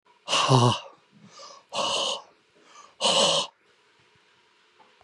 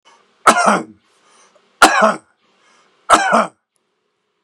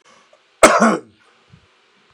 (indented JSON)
{
  "exhalation_length": "5.0 s",
  "exhalation_amplitude": 18400,
  "exhalation_signal_mean_std_ratio": 0.43,
  "three_cough_length": "4.4 s",
  "three_cough_amplitude": 32768,
  "three_cough_signal_mean_std_ratio": 0.37,
  "cough_length": "2.1 s",
  "cough_amplitude": 32768,
  "cough_signal_mean_std_ratio": 0.31,
  "survey_phase": "beta (2021-08-13 to 2022-03-07)",
  "age": "45-64",
  "gender": "Male",
  "wearing_mask": "No",
  "symptom_cough_any": true,
  "symptom_runny_or_blocked_nose": true,
  "symptom_fatigue": true,
  "symptom_onset": "12 days",
  "smoker_status": "Current smoker (11 or more cigarettes per day)",
  "respiratory_condition_asthma": false,
  "respiratory_condition_other": true,
  "recruitment_source": "REACT",
  "submission_delay": "3 days",
  "covid_test_result": "Negative",
  "covid_test_method": "RT-qPCR",
  "influenza_a_test_result": "Negative",
  "influenza_b_test_result": "Negative"
}